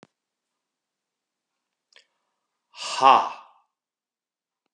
exhalation_length: 4.7 s
exhalation_amplitude: 27950
exhalation_signal_mean_std_ratio: 0.19
survey_phase: beta (2021-08-13 to 2022-03-07)
age: 45-64
gender: Male
wearing_mask: 'No'
symptom_cough_any: true
symptom_runny_or_blocked_nose: true
symptom_onset: 6 days
smoker_status: Ex-smoker
respiratory_condition_asthma: false
respiratory_condition_other: false
recruitment_source: REACT
submission_delay: 2 days
covid_test_result: Negative
covid_test_method: RT-qPCR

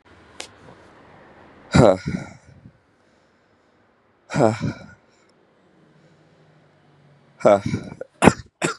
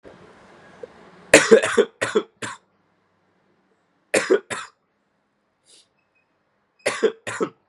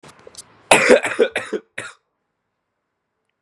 exhalation_length: 8.8 s
exhalation_amplitude: 32768
exhalation_signal_mean_std_ratio: 0.27
three_cough_length: 7.7 s
three_cough_amplitude: 32768
three_cough_signal_mean_std_ratio: 0.28
cough_length: 3.4 s
cough_amplitude: 32768
cough_signal_mean_std_ratio: 0.32
survey_phase: beta (2021-08-13 to 2022-03-07)
age: 18-44
gender: Male
wearing_mask: 'No'
symptom_cough_any: true
symptom_runny_or_blocked_nose: true
symptom_sore_throat: true
symptom_fatigue: true
symptom_headache: true
symptom_other: true
symptom_onset: 4 days
smoker_status: Never smoked
respiratory_condition_asthma: false
respiratory_condition_other: false
recruitment_source: Test and Trace
submission_delay: 2 days
covid_test_result: Positive
covid_test_method: RT-qPCR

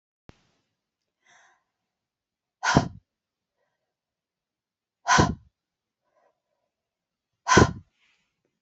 exhalation_length: 8.6 s
exhalation_amplitude: 24189
exhalation_signal_mean_std_ratio: 0.21
survey_phase: beta (2021-08-13 to 2022-03-07)
age: 45-64
gender: Female
wearing_mask: 'No'
symptom_none: true
smoker_status: Never smoked
respiratory_condition_asthma: false
respiratory_condition_other: false
recruitment_source: REACT
submission_delay: 9 days
covid_test_result: Negative
covid_test_method: RT-qPCR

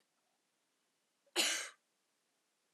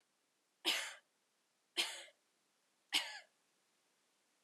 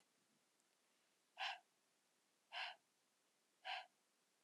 cough_length: 2.7 s
cough_amplitude: 3612
cough_signal_mean_std_ratio: 0.26
three_cough_length: 4.4 s
three_cough_amplitude: 3223
three_cough_signal_mean_std_ratio: 0.29
exhalation_length: 4.4 s
exhalation_amplitude: 669
exhalation_signal_mean_std_ratio: 0.32
survey_phase: alpha (2021-03-01 to 2021-08-12)
age: 18-44
gender: Female
wearing_mask: 'No'
symptom_cough_any: true
symptom_fatigue: true
symptom_headache: true
symptom_change_to_sense_of_smell_or_taste: true
symptom_onset: 5 days
smoker_status: Prefer not to say
respiratory_condition_asthma: false
respiratory_condition_other: false
recruitment_source: Test and Trace
submission_delay: 1 day
covid_test_result: Positive
covid_test_method: RT-qPCR
covid_ct_value: 15.1
covid_ct_gene: ORF1ab gene
covid_ct_mean: 15.3
covid_viral_load: 9800000 copies/ml
covid_viral_load_category: High viral load (>1M copies/ml)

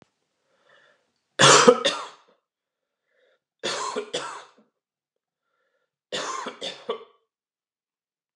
three_cough_length: 8.4 s
three_cough_amplitude: 31921
three_cough_signal_mean_std_ratio: 0.26
survey_phase: alpha (2021-03-01 to 2021-08-12)
age: 45-64
gender: Male
wearing_mask: 'No'
symptom_none: true
smoker_status: Ex-smoker
respiratory_condition_asthma: false
respiratory_condition_other: false
recruitment_source: REACT
submission_delay: 32 days
covid_test_result: Negative
covid_test_method: RT-qPCR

